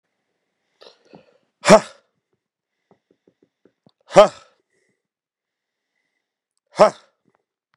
exhalation_length: 7.8 s
exhalation_amplitude: 32768
exhalation_signal_mean_std_ratio: 0.16
survey_phase: beta (2021-08-13 to 2022-03-07)
age: 45-64
gender: Male
wearing_mask: 'No'
symptom_cough_any: true
symptom_new_continuous_cough: true
symptom_runny_or_blocked_nose: true
symptom_shortness_of_breath: true
symptom_sore_throat: true
symptom_fatigue: true
symptom_fever_high_temperature: true
symptom_headache: true
symptom_change_to_sense_of_smell_or_taste: true
symptom_onset: 3 days
smoker_status: Never smoked
respiratory_condition_asthma: false
respiratory_condition_other: false
recruitment_source: Test and Trace
submission_delay: 1 day
covid_test_result: Positive
covid_test_method: RT-qPCR
covid_ct_value: 19.4
covid_ct_gene: ORF1ab gene
covid_ct_mean: 19.7
covid_viral_load: 330000 copies/ml
covid_viral_load_category: Low viral load (10K-1M copies/ml)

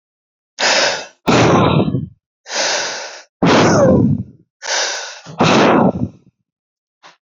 exhalation_length: 7.3 s
exhalation_amplitude: 29873
exhalation_signal_mean_std_ratio: 0.61
survey_phase: beta (2021-08-13 to 2022-03-07)
age: 18-44
gender: Male
wearing_mask: 'Yes'
symptom_cough_any: true
symptom_new_continuous_cough: true
symptom_runny_or_blocked_nose: true
symptom_sore_throat: true
symptom_abdominal_pain: true
symptom_fatigue: true
symptom_fever_high_temperature: true
symptom_headache: true
symptom_change_to_sense_of_smell_or_taste: true
symptom_loss_of_taste: true
symptom_other: true
symptom_onset: 3 days
smoker_status: Ex-smoker
respiratory_condition_asthma: false
respiratory_condition_other: false
recruitment_source: Test and Trace
submission_delay: 1 day
covid_test_result: Positive
covid_test_method: RT-qPCR
covid_ct_value: 15.4
covid_ct_gene: ORF1ab gene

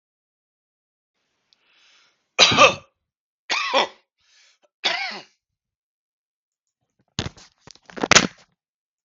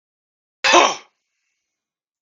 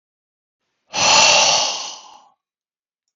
three_cough_length: 9.0 s
three_cough_amplitude: 32768
three_cough_signal_mean_std_ratio: 0.24
cough_length: 2.2 s
cough_amplitude: 32768
cough_signal_mean_std_ratio: 0.27
exhalation_length: 3.2 s
exhalation_amplitude: 32768
exhalation_signal_mean_std_ratio: 0.44
survey_phase: beta (2021-08-13 to 2022-03-07)
age: 45-64
gender: Male
wearing_mask: 'No'
symptom_none: true
smoker_status: Ex-smoker
respiratory_condition_asthma: false
respiratory_condition_other: false
recruitment_source: REACT
submission_delay: 1 day
covid_test_result: Negative
covid_test_method: RT-qPCR
influenza_a_test_result: Negative
influenza_b_test_result: Negative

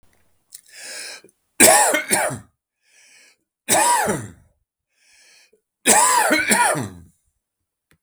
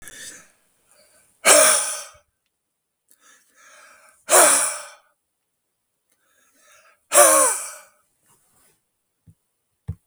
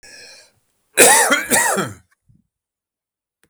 three_cough_length: 8.0 s
three_cough_amplitude: 32768
three_cough_signal_mean_std_ratio: 0.43
exhalation_length: 10.1 s
exhalation_amplitude: 32768
exhalation_signal_mean_std_ratio: 0.3
cough_length: 3.5 s
cough_amplitude: 32768
cough_signal_mean_std_ratio: 0.39
survey_phase: beta (2021-08-13 to 2022-03-07)
age: 65+
gender: Male
wearing_mask: 'No'
symptom_none: true
smoker_status: Never smoked
respiratory_condition_asthma: false
respiratory_condition_other: false
recruitment_source: REACT
submission_delay: 3 days
covid_test_result: Negative
covid_test_method: RT-qPCR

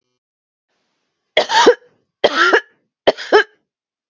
three_cough_length: 4.1 s
three_cough_amplitude: 32768
three_cough_signal_mean_std_ratio: 0.35
survey_phase: beta (2021-08-13 to 2022-03-07)
age: 45-64
gender: Female
wearing_mask: 'No'
symptom_sore_throat: true
symptom_fatigue: true
symptom_onset: 8 days
smoker_status: Never smoked
respiratory_condition_asthma: false
respiratory_condition_other: false
recruitment_source: REACT
submission_delay: 1 day
covid_test_result: Negative
covid_test_method: RT-qPCR
influenza_a_test_result: Negative
influenza_b_test_result: Negative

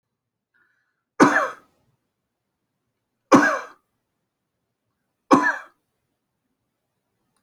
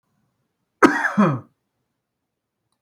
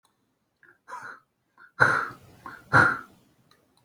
three_cough_length: 7.4 s
three_cough_amplitude: 25919
three_cough_signal_mean_std_ratio: 0.24
cough_length: 2.8 s
cough_amplitude: 27922
cough_signal_mean_std_ratio: 0.3
exhalation_length: 3.8 s
exhalation_amplitude: 26039
exhalation_signal_mean_std_ratio: 0.31
survey_phase: alpha (2021-03-01 to 2021-08-12)
age: 45-64
gender: Male
wearing_mask: 'No'
symptom_none: true
smoker_status: Ex-smoker
respiratory_condition_asthma: false
respiratory_condition_other: false
recruitment_source: REACT
submission_delay: 1 day
covid_test_result: Negative
covid_test_method: RT-qPCR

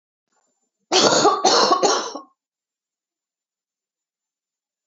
three_cough_length: 4.9 s
three_cough_amplitude: 28227
three_cough_signal_mean_std_ratio: 0.39
survey_phase: alpha (2021-03-01 to 2021-08-12)
age: 45-64
gender: Female
wearing_mask: 'No'
symptom_cough_any: true
symptom_fatigue: true
symptom_onset: 5 days
smoker_status: Ex-smoker
respiratory_condition_asthma: false
respiratory_condition_other: false
recruitment_source: Test and Trace
submission_delay: 2 days
covid_test_result: Positive
covid_test_method: RT-qPCR
covid_ct_value: 11.5
covid_ct_gene: ORF1ab gene
covid_ct_mean: 12.3
covid_viral_load: 93000000 copies/ml
covid_viral_load_category: High viral load (>1M copies/ml)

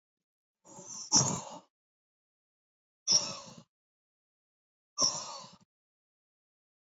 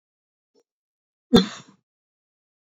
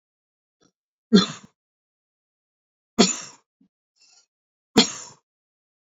exhalation_length: 6.8 s
exhalation_amplitude: 8814
exhalation_signal_mean_std_ratio: 0.28
cough_length: 2.7 s
cough_amplitude: 27444
cough_signal_mean_std_ratio: 0.17
three_cough_length: 5.9 s
three_cough_amplitude: 31144
three_cough_signal_mean_std_ratio: 0.2
survey_phase: beta (2021-08-13 to 2022-03-07)
age: 45-64
gender: Male
wearing_mask: 'No'
symptom_none: true
smoker_status: Never smoked
respiratory_condition_asthma: false
respiratory_condition_other: false
recruitment_source: REACT
submission_delay: 0 days
covid_test_result: Negative
covid_test_method: RT-qPCR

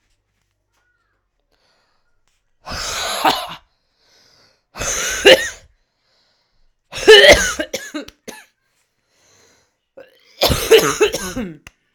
exhalation_length: 11.9 s
exhalation_amplitude: 32768
exhalation_signal_mean_std_ratio: 0.32
survey_phase: alpha (2021-03-01 to 2021-08-12)
age: 18-44
gender: Female
wearing_mask: 'No'
symptom_cough_any: true
symptom_new_continuous_cough: true
symptom_abdominal_pain: true
symptom_fatigue: true
symptom_fever_high_temperature: true
symptom_headache: true
smoker_status: Never smoked
respiratory_condition_asthma: false
respiratory_condition_other: false
recruitment_source: Test and Trace
submission_delay: 2 days
covid_test_result: Positive
covid_test_method: RT-qPCR
covid_ct_value: 29.2
covid_ct_gene: ORF1ab gene
covid_ct_mean: 30.0
covid_viral_load: 140 copies/ml
covid_viral_load_category: Minimal viral load (< 10K copies/ml)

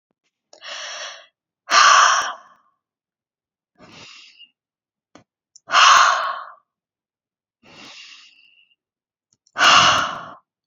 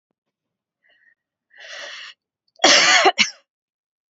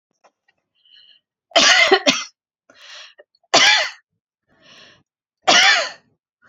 exhalation_length: 10.7 s
exhalation_amplitude: 32768
exhalation_signal_mean_std_ratio: 0.34
cough_length: 4.1 s
cough_amplitude: 32767
cough_signal_mean_std_ratio: 0.32
three_cough_length: 6.5 s
three_cough_amplitude: 32767
three_cough_signal_mean_std_ratio: 0.37
survey_phase: beta (2021-08-13 to 2022-03-07)
age: 18-44
gender: Female
wearing_mask: 'No'
symptom_runny_or_blocked_nose: true
symptom_onset: 3 days
smoker_status: Never smoked
respiratory_condition_asthma: false
respiratory_condition_other: false
recruitment_source: REACT
submission_delay: 4 days
covid_test_result: Negative
covid_test_method: RT-qPCR
influenza_a_test_result: Negative
influenza_b_test_result: Negative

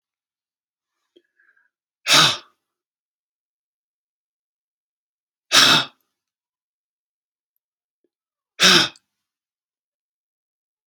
exhalation_length: 10.9 s
exhalation_amplitude: 32768
exhalation_signal_mean_std_ratio: 0.22
survey_phase: alpha (2021-03-01 to 2021-08-12)
age: 45-64
gender: Male
wearing_mask: 'No'
symptom_none: true
smoker_status: Ex-smoker
respiratory_condition_asthma: true
respiratory_condition_other: false
recruitment_source: REACT
submission_delay: 1 day
covid_test_result: Negative
covid_test_method: RT-qPCR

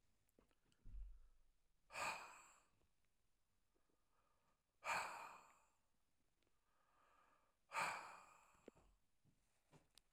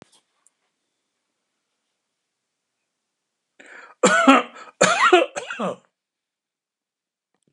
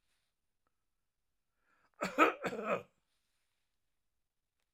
exhalation_length: 10.1 s
exhalation_amplitude: 880
exhalation_signal_mean_std_ratio: 0.35
three_cough_length: 7.5 s
three_cough_amplitude: 32717
three_cough_signal_mean_std_ratio: 0.28
cough_length: 4.7 s
cough_amplitude: 7804
cough_signal_mean_std_ratio: 0.24
survey_phase: alpha (2021-03-01 to 2021-08-12)
age: 65+
gender: Male
wearing_mask: 'No'
symptom_none: true
smoker_status: Never smoked
respiratory_condition_asthma: false
respiratory_condition_other: false
recruitment_source: REACT
submission_delay: 2 days
covid_test_result: Negative
covid_test_method: RT-qPCR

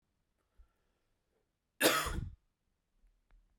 cough_length: 3.6 s
cough_amplitude: 6946
cough_signal_mean_std_ratio: 0.26
survey_phase: beta (2021-08-13 to 2022-03-07)
age: 18-44
gender: Male
wearing_mask: 'No'
symptom_runny_or_blocked_nose: true
symptom_fatigue: true
symptom_onset: 3 days
smoker_status: Ex-smoker
respiratory_condition_asthma: false
respiratory_condition_other: false
recruitment_source: Test and Trace
submission_delay: 2 days
covid_test_result: Positive
covid_test_method: ePCR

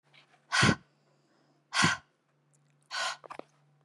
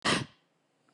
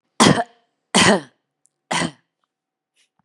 exhalation_length: 3.8 s
exhalation_amplitude: 9236
exhalation_signal_mean_std_ratio: 0.33
cough_length: 0.9 s
cough_amplitude: 5316
cough_signal_mean_std_ratio: 0.37
three_cough_length: 3.2 s
three_cough_amplitude: 32767
three_cough_signal_mean_std_ratio: 0.34
survey_phase: beta (2021-08-13 to 2022-03-07)
age: 18-44
gender: Female
wearing_mask: 'No'
symptom_none: true
smoker_status: Current smoker (11 or more cigarettes per day)
respiratory_condition_asthma: true
respiratory_condition_other: false
recruitment_source: REACT
submission_delay: 0 days
covid_test_result: Negative
covid_test_method: RT-qPCR
influenza_a_test_result: Negative
influenza_b_test_result: Negative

